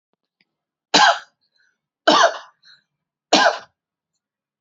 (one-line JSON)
{"three_cough_length": "4.6 s", "three_cough_amplitude": 32767, "three_cough_signal_mean_std_ratio": 0.31, "survey_phase": "beta (2021-08-13 to 2022-03-07)", "age": "18-44", "gender": "Female", "wearing_mask": "No", "symptom_runny_or_blocked_nose": true, "symptom_shortness_of_breath": true, "symptom_sore_throat": true, "symptom_diarrhoea": true, "symptom_fatigue": true, "symptom_headache": true, "symptom_onset": "4 days", "smoker_status": "Never smoked", "respiratory_condition_asthma": false, "respiratory_condition_other": false, "recruitment_source": "Test and Trace", "submission_delay": "1 day", "covid_test_result": "Positive", "covid_test_method": "RT-qPCR", "covid_ct_value": 19.8, "covid_ct_gene": "ORF1ab gene", "covid_ct_mean": 20.9, "covid_viral_load": "140000 copies/ml", "covid_viral_load_category": "Low viral load (10K-1M copies/ml)"}